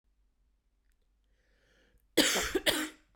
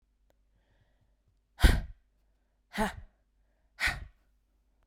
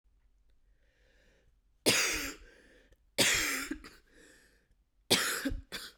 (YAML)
cough_length: 3.2 s
cough_amplitude: 10175
cough_signal_mean_std_ratio: 0.34
exhalation_length: 4.9 s
exhalation_amplitude: 13579
exhalation_signal_mean_std_ratio: 0.23
three_cough_length: 6.0 s
three_cough_amplitude: 10724
three_cough_signal_mean_std_ratio: 0.41
survey_phase: beta (2021-08-13 to 2022-03-07)
age: 18-44
gender: Female
wearing_mask: 'No'
symptom_cough_any: true
symptom_runny_or_blocked_nose: true
symptom_shortness_of_breath: true
symptom_fatigue: true
symptom_headache: true
symptom_change_to_sense_of_smell_or_taste: true
symptom_loss_of_taste: true
smoker_status: Never smoked
respiratory_condition_asthma: false
respiratory_condition_other: false
recruitment_source: Test and Trace
submission_delay: 5 days
covid_test_result: Positive
covid_test_method: RT-qPCR
covid_ct_value: 24.5
covid_ct_gene: ORF1ab gene
covid_ct_mean: 25.1
covid_viral_load: 6000 copies/ml
covid_viral_load_category: Minimal viral load (< 10K copies/ml)